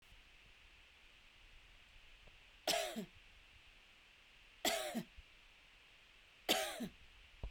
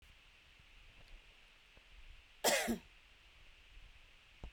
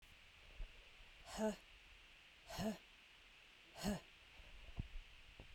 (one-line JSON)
{"three_cough_length": "7.5 s", "three_cough_amplitude": 3971, "three_cough_signal_mean_std_ratio": 0.41, "cough_length": "4.5 s", "cough_amplitude": 4131, "cough_signal_mean_std_ratio": 0.34, "exhalation_length": "5.5 s", "exhalation_amplitude": 1088, "exhalation_signal_mean_std_ratio": 0.52, "survey_phase": "beta (2021-08-13 to 2022-03-07)", "age": "45-64", "gender": "Female", "wearing_mask": "No", "symptom_none": true, "smoker_status": "Prefer not to say", "respiratory_condition_asthma": false, "respiratory_condition_other": false, "recruitment_source": "REACT", "submission_delay": "2 days", "covid_test_result": "Negative", "covid_test_method": "RT-qPCR"}